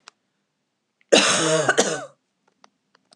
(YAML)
cough_length: 3.2 s
cough_amplitude: 30999
cough_signal_mean_std_ratio: 0.4
survey_phase: beta (2021-08-13 to 2022-03-07)
age: 65+
gender: Female
wearing_mask: 'No'
symptom_none: true
smoker_status: Never smoked
respiratory_condition_asthma: false
respiratory_condition_other: false
recruitment_source: REACT
submission_delay: 1 day
covid_test_result: Negative
covid_test_method: RT-qPCR
influenza_a_test_result: Negative
influenza_b_test_result: Negative